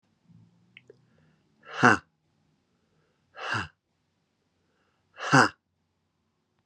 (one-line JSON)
{"exhalation_length": "6.7 s", "exhalation_amplitude": 24183, "exhalation_signal_mean_std_ratio": 0.21, "survey_phase": "beta (2021-08-13 to 2022-03-07)", "age": "45-64", "gender": "Male", "wearing_mask": "No", "symptom_none": true, "smoker_status": "Never smoked", "respiratory_condition_asthma": false, "respiratory_condition_other": false, "recruitment_source": "REACT", "submission_delay": "1 day", "covid_test_result": "Negative", "covid_test_method": "RT-qPCR"}